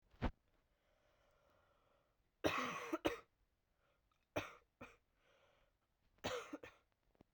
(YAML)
three_cough_length: 7.3 s
three_cough_amplitude: 3196
three_cough_signal_mean_std_ratio: 0.31
survey_phase: beta (2021-08-13 to 2022-03-07)
age: 18-44
gender: Female
wearing_mask: 'No'
symptom_cough_any: true
symptom_runny_or_blocked_nose: true
symptom_sore_throat: true
symptom_headache: true
symptom_other: true
symptom_onset: 2 days
smoker_status: Never smoked
respiratory_condition_asthma: false
respiratory_condition_other: false
recruitment_source: Test and Trace
submission_delay: 1 day
covid_test_result: Positive
covid_test_method: RT-qPCR